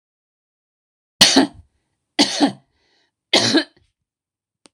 {"three_cough_length": "4.7 s", "three_cough_amplitude": 26028, "three_cough_signal_mean_std_ratio": 0.32, "survey_phase": "beta (2021-08-13 to 2022-03-07)", "age": "45-64", "gender": "Female", "wearing_mask": "No", "symptom_cough_any": true, "symptom_fatigue": true, "symptom_onset": "8 days", "smoker_status": "Never smoked", "respiratory_condition_asthma": false, "respiratory_condition_other": false, "recruitment_source": "REACT", "submission_delay": "1 day", "covid_test_result": "Negative", "covid_test_method": "RT-qPCR"}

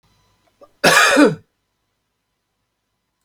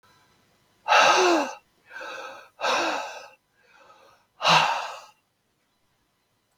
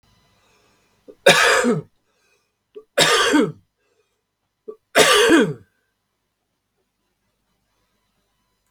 {"cough_length": "3.2 s", "cough_amplitude": 32768, "cough_signal_mean_std_ratio": 0.32, "exhalation_length": "6.6 s", "exhalation_amplitude": 20624, "exhalation_signal_mean_std_ratio": 0.4, "three_cough_length": "8.7 s", "three_cough_amplitude": 32768, "three_cough_signal_mean_std_ratio": 0.35, "survey_phase": "beta (2021-08-13 to 2022-03-07)", "age": "65+", "gender": "Male", "wearing_mask": "No", "symptom_cough_any": true, "symptom_runny_or_blocked_nose": true, "symptom_sore_throat": true, "symptom_headache": true, "symptom_other": true, "symptom_onset": "3 days", "smoker_status": "Never smoked", "respiratory_condition_asthma": false, "respiratory_condition_other": false, "recruitment_source": "Test and Trace", "submission_delay": "2 days", "covid_test_result": "Positive", "covid_test_method": "RT-qPCR"}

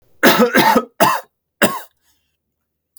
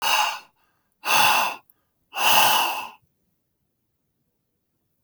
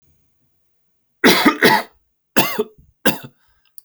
{"cough_length": "3.0 s", "cough_amplitude": 32768, "cough_signal_mean_std_ratio": 0.45, "exhalation_length": "5.0 s", "exhalation_amplitude": 20953, "exhalation_signal_mean_std_ratio": 0.44, "three_cough_length": "3.8 s", "three_cough_amplitude": 32767, "three_cough_signal_mean_std_ratio": 0.37, "survey_phase": "beta (2021-08-13 to 2022-03-07)", "age": "65+", "gender": "Male", "wearing_mask": "No", "symptom_cough_any": true, "symptom_runny_or_blocked_nose": true, "symptom_fatigue": true, "symptom_headache": true, "symptom_onset": "4 days", "smoker_status": "Ex-smoker", "respiratory_condition_asthma": false, "respiratory_condition_other": false, "recruitment_source": "Test and Trace", "submission_delay": "2 days", "covid_test_result": "Positive", "covid_test_method": "RT-qPCR", "covid_ct_value": 25.6, "covid_ct_gene": "S gene", "covid_ct_mean": 25.9, "covid_viral_load": "3300 copies/ml", "covid_viral_load_category": "Minimal viral load (< 10K copies/ml)"}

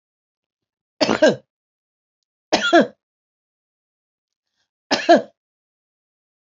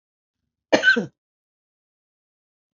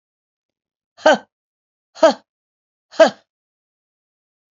{"three_cough_length": "6.6 s", "three_cough_amplitude": 29818, "three_cough_signal_mean_std_ratio": 0.26, "cough_length": "2.7 s", "cough_amplitude": 30103, "cough_signal_mean_std_ratio": 0.24, "exhalation_length": "4.5 s", "exhalation_amplitude": 31422, "exhalation_signal_mean_std_ratio": 0.21, "survey_phase": "beta (2021-08-13 to 2022-03-07)", "age": "65+", "gender": "Female", "wearing_mask": "No", "symptom_none": true, "smoker_status": "Ex-smoker", "respiratory_condition_asthma": false, "respiratory_condition_other": false, "recruitment_source": "REACT", "submission_delay": "3 days", "covid_test_result": "Negative", "covid_test_method": "RT-qPCR", "influenza_a_test_result": "Negative", "influenza_b_test_result": "Negative"}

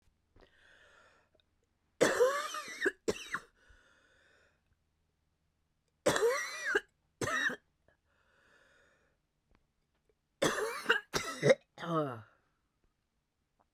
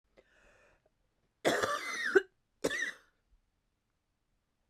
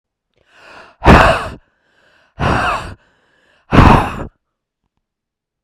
{"three_cough_length": "13.7 s", "three_cough_amplitude": 7864, "three_cough_signal_mean_std_ratio": 0.35, "cough_length": "4.7 s", "cough_amplitude": 7979, "cough_signal_mean_std_ratio": 0.32, "exhalation_length": "5.6 s", "exhalation_amplitude": 32768, "exhalation_signal_mean_std_ratio": 0.36, "survey_phase": "beta (2021-08-13 to 2022-03-07)", "age": "45-64", "gender": "Female", "wearing_mask": "No", "symptom_cough_any": true, "symptom_runny_or_blocked_nose": true, "symptom_shortness_of_breath": true, "symptom_sore_throat": true, "symptom_fatigue": true, "symptom_change_to_sense_of_smell_or_taste": true, "symptom_onset": "3 days", "smoker_status": "Ex-smoker", "respiratory_condition_asthma": false, "respiratory_condition_other": false, "recruitment_source": "Test and Trace", "submission_delay": "2 days", "covid_test_result": "Positive", "covid_test_method": "RT-qPCR", "covid_ct_value": 18.2, "covid_ct_gene": "N gene", "covid_ct_mean": 18.6, "covid_viral_load": "800000 copies/ml", "covid_viral_load_category": "Low viral load (10K-1M copies/ml)"}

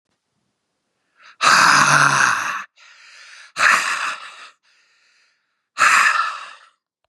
{"exhalation_length": "7.1 s", "exhalation_amplitude": 32149, "exhalation_signal_mean_std_ratio": 0.47, "survey_phase": "beta (2021-08-13 to 2022-03-07)", "age": "45-64", "gender": "Male", "wearing_mask": "No", "symptom_none": true, "smoker_status": "Never smoked", "respiratory_condition_asthma": false, "respiratory_condition_other": false, "recruitment_source": "REACT", "submission_delay": "4 days", "covid_test_result": "Negative", "covid_test_method": "RT-qPCR", "influenza_a_test_result": "Unknown/Void", "influenza_b_test_result": "Unknown/Void"}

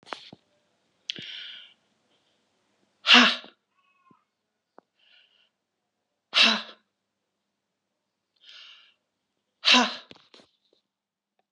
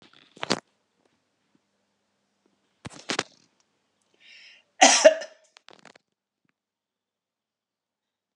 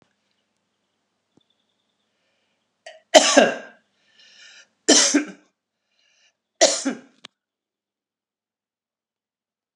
{"exhalation_length": "11.5 s", "exhalation_amplitude": 28223, "exhalation_signal_mean_std_ratio": 0.22, "cough_length": "8.4 s", "cough_amplitude": 28449, "cough_signal_mean_std_ratio": 0.17, "three_cough_length": "9.8 s", "three_cough_amplitude": 32768, "three_cough_signal_mean_std_ratio": 0.23, "survey_phase": "alpha (2021-03-01 to 2021-08-12)", "age": "65+", "gender": "Female", "wearing_mask": "No", "symptom_none": true, "smoker_status": "Never smoked", "respiratory_condition_asthma": false, "respiratory_condition_other": false, "recruitment_source": "REACT", "submission_delay": "3 days", "covid_test_result": "Negative", "covid_test_method": "RT-qPCR"}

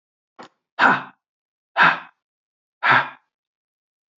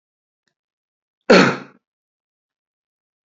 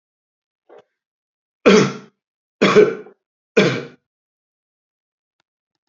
{"exhalation_length": "4.2 s", "exhalation_amplitude": 26395, "exhalation_signal_mean_std_ratio": 0.31, "cough_length": "3.2 s", "cough_amplitude": 29274, "cough_signal_mean_std_ratio": 0.21, "three_cough_length": "5.9 s", "three_cough_amplitude": 32767, "three_cough_signal_mean_std_ratio": 0.28, "survey_phase": "beta (2021-08-13 to 2022-03-07)", "age": "65+", "gender": "Male", "wearing_mask": "No", "symptom_none": true, "smoker_status": "Ex-smoker", "respiratory_condition_asthma": false, "respiratory_condition_other": false, "recruitment_source": "REACT", "submission_delay": "2 days", "covid_test_result": "Negative", "covid_test_method": "RT-qPCR", "influenza_a_test_result": "Negative", "influenza_b_test_result": "Negative"}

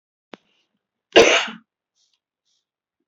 {"cough_length": "3.1 s", "cough_amplitude": 30031, "cough_signal_mean_std_ratio": 0.23, "survey_phase": "beta (2021-08-13 to 2022-03-07)", "age": "45-64", "gender": "Female", "wearing_mask": "No", "symptom_none": true, "smoker_status": "Never smoked", "respiratory_condition_asthma": true, "respiratory_condition_other": false, "recruitment_source": "REACT", "submission_delay": "1 day", "covid_test_result": "Negative", "covid_test_method": "RT-qPCR", "influenza_a_test_result": "Unknown/Void", "influenza_b_test_result": "Unknown/Void"}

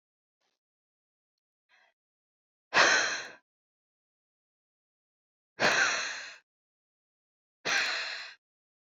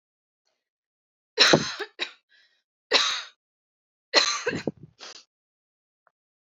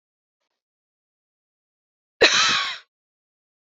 {"exhalation_length": "8.9 s", "exhalation_amplitude": 11667, "exhalation_signal_mean_std_ratio": 0.32, "three_cough_length": "6.5 s", "three_cough_amplitude": 27140, "three_cough_signal_mean_std_ratio": 0.3, "cough_length": "3.7 s", "cough_amplitude": 27429, "cough_signal_mean_std_ratio": 0.28, "survey_phase": "alpha (2021-03-01 to 2021-08-12)", "age": "18-44", "gender": "Female", "wearing_mask": "No", "symptom_fatigue": true, "symptom_headache": true, "symptom_onset": "5 days", "smoker_status": "Never smoked", "respiratory_condition_asthma": false, "respiratory_condition_other": false, "recruitment_source": "Test and Trace", "submission_delay": "2 days", "covid_test_result": "Positive", "covid_test_method": "RT-qPCR", "covid_ct_value": 37.7, "covid_ct_gene": "N gene"}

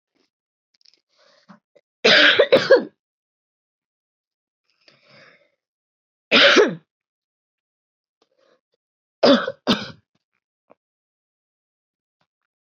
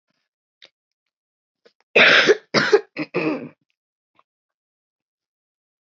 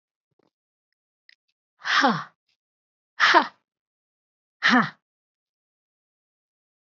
{"three_cough_length": "12.6 s", "three_cough_amplitude": 24883, "three_cough_signal_mean_std_ratio": 0.26, "cough_length": "5.8 s", "cough_amplitude": 25383, "cough_signal_mean_std_ratio": 0.3, "exhalation_length": "7.0 s", "exhalation_amplitude": 24396, "exhalation_signal_mean_std_ratio": 0.26, "survey_phase": "beta (2021-08-13 to 2022-03-07)", "age": "18-44", "gender": "Female", "wearing_mask": "No", "symptom_cough_any": true, "symptom_new_continuous_cough": true, "symptom_runny_or_blocked_nose": true, "symptom_sore_throat": true, "symptom_abdominal_pain": true, "symptom_fever_high_temperature": true, "symptom_headache": true, "symptom_change_to_sense_of_smell_or_taste": true, "symptom_loss_of_taste": true, "smoker_status": "Never smoked", "respiratory_condition_asthma": false, "respiratory_condition_other": false, "recruitment_source": "Test and Trace", "submission_delay": "2 days", "covid_test_result": "Positive", "covid_test_method": "LFT"}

